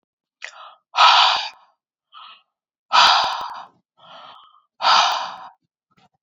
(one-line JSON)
{"exhalation_length": "6.2 s", "exhalation_amplitude": 29827, "exhalation_signal_mean_std_ratio": 0.4, "survey_phase": "beta (2021-08-13 to 2022-03-07)", "age": "18-44", "gender": "Female", "wearing_mask": "No", "symptom_none": true, "smoker_status": "Never smoked", "respiratory_condition_asthma": false, "respiratory_condition_other": false, "recruitment_source": "REACT", "submission_delay": "6 days", "covid_test_result": "Negative", "covid_test_method": "RT-qPCR"}